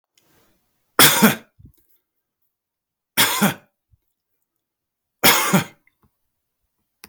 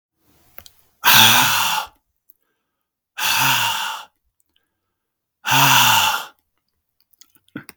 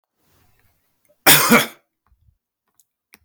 {
  "three_cough_length": "7.1 s",
  "three_cough_amplitude": 32768,
  "three_cough_signal_mean_std_ratio": 0.29,
  "exhalation_length": "7.8 s",
  "exhalation_amplitude": 32768,
  "exhalation_signal_mean_std_ratio": 0.44,
  "cough_length": "3.2 s",
  "cough_amplitude": 32768,
  "cough_signal_mean_std_ratio": 0.27,
  "survey_phase": "beta (2021-08-13 to 2022-03-07)",
  "age": "45-64",
  "gender": "Male",
  "wearing_mask": "No",
  "symptom_none": true,
  "symptom_onset": "12 days",
  "smoker_status": "Never smoked",
  "respiratory_condition_asthma": false,
  "respiratory_condition_other": false,
  "recruitment_source": "REACT",
  "submission_delay": "3 days",
  "covid_test_result": "Negative",
  "covid_test_method": "RT-qPCR",
  "influenza_a_test_result": "Unknown/Void",
  "influenza_b_test_result": "Unknown/Void"
}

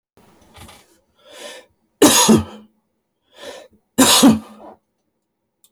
{
  "cough_length": "5.7 s",
  "cough_amplitude": 32767,
  "cough_signal_mean_std_ratio": 0.33,
  "survey_phase": "beta (2021-08-13 to 2022-03-07)",
  "age": "65+",
  "gender": "Male",
  "wearing_mask": "No",
  "symptom_none": true,
  "smoker_status": "Never smoked",
  "respiratory_condition_asthma": false,
  "respiratory_condition_other": false,
  "recruitment_source": "REACT",
  "submission_delay": "1 day",
  "covid_test_result": "Negative",
  "covid_test_method": "RT-qPCR"
}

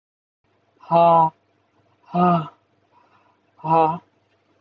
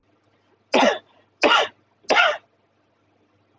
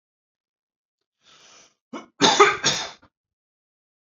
{
  "exhalation_length": "4.6 s",
  "exhalation_amplitude": 19806,
  "exhalation_signal_mean_std_ratio": 0.38,
  "three_cough_length": "3.6 s",
  "three_cough_amplitude": 24691,
  "three_cough_signal_mean_std_ratio": 0.37,
  "cough_length": "4.0 s",
  "cough_amplitude": 30100,
  "cough_signal_mean_std_ratio": 0.27,
  "survey_phase": "alpha (2021-03-01 to 2021-08-12)",
  "age": "18-44",
  "gender": "Male",
  "wearing_mask": "Yes",
  "symptom_none": true,
  "smoker_status": "Never smoked",
  "respiratory_condition_asthma": false,
  "respiratory_condition_other": false,
  "recruitment_source": "REACT",
  "submission_delay": "1 day",
  "covid_test_result": "Negative",
  "covid_test_method": "RT-qPCR"
}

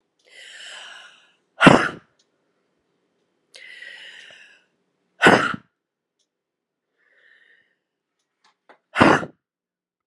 {
  "exhalation_length": "10.1 s",
  "exhalation_amplitude": 32768,
  "exhalation_signal_mean_std_ratio": 0.22,
  "survey_phase": "alpha (2021-03-01 to 2021-08-12)",
  "age": "45-64",
  "gender": "Female",
  "wearing_mask": "No",
  "symptom_fatigue": true,
  "symptom_headache": true,
  "symptom_change_to_sense_of_smell_or_taste": true,
  "symptom_onset": "5 days",
  "smoker_status": "Ex-smoker",
  "respiratory_condition_asthma": true,
  "respiratory_condition_other": false,
  "recruitment_source": "Test and Trace",
  "submission_delay": "2 days",
  "covid_test_result": "Positive",
  "covid_test_method": "RT-qPCR",
  "covid_ct_value": 12.3,
  "covid_ct_gene": "ORF1ab gene",
  "covid_ct_mean": 12.9,
  "covid_viral_load": "61000000 copies/ml",
  "covid_viral_load_category": "High viral load (>1M copies/ml)"
}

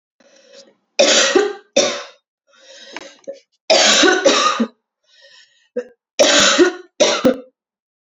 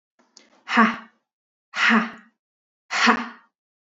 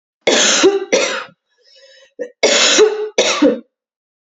{
  "three_cough_length": "8.0 s",
  "three_cough_amplitude": 30692,
  "three_cough_signal_mean_std_ratio": 0.49,
  "exhalation_length": "3.9 s",
  "exhalation_amplitude": 26823,
  "exhalation_signal_mean_std_ratio": 0.38,
  "cough_length": "4.3 s",
  "cough_amplitude": 32768,
  "cough_signal_mean_std_ratio": 0.58,
  "survey_phase": "beta (2021-08-13 to 2022-03-07)",
  "age": "18-44",
  "gender": "Female",
  "wearing_mask": "No",
  "symptom_cough_any": true,
  "symptom_runny_or_blocked_nose": true,
  "symptom_fatigue": true,
  "symptom_headache": true,
  "symptom_other": true,
  "smoker_status": "Never smoked",
  "respiratory_condition_asthma": false,
  "respiratory_condition_other": false,
  "recruitment_source": "Test and Trace",
  "submission_delay": "4 days",
  "covid_test_result": "Positive",
  "covid_test_method": "RT-qPCR",
  "covid_ct_value": 23.6,
  "covid_ct_gene": "ORF1ab gene"
}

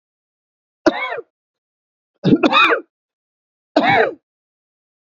{
  "three_cough_length": "5.1 s",
  "three_cough_amplitude": 29656,
  "three_cough_signal_mean_std_ratio": 0.36,
  "survey_phase": "beta (2021-08-13 to 2022-03-07)",
  "age": "45-64",
  "gender": "Male",
  "wearing_mask": "No",
  "symptom_runny_or_blocked_nose": true,
  "symptom_other": true,
  "smoker_status": "Never smoked",
  "respiratory_condition_asthma": false,
  "respiratory_condition_other": false,
  "recruitment_source": "Test and Trace",
  "submission_delay": "1 day",
  "covid_test_result": "Negative",
  "covid_test_method": "RT-qPCR"
}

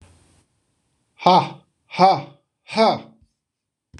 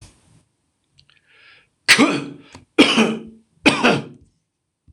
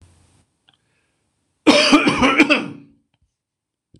{
  "exhalation_length": "4.0 s",
  "exhalation_amplitude": 26028,
  "exhalation_signal_mean_std_ratio": 0.34,
  "three_cough_length": "4.9 s",
  "three_cough_amplitude": 26028,
  "three_cough_signal_mean_std_ratio": 0.36,
  "cough_length": "4.0 s",
  "cough_amplitude": 26028,
  "cough_signal_mean_std_ratio": 0.38,
  "survey_phase": "beta (2021-08-13 to 2022-03-07)",
  "age": "45-64",
  "gender": "Male",
  "wearing_mask": "No",
  "symptom_none": true,
  "symptom_onset": "12 days",
  "smoker_status": "Ex-smoker",
  "respiratory_condition_asthma": false,
  "respiratory_condition_other": false,
  "recruitment_source": "REACT",
  "submission_delay": "2 days",
  "covid_test_result": "Negative",
  "covid_test_method": "RT-qPCR",
  "influenza_a_test_result": "Negative",
  "influenza_b_test_result": "Negative"
}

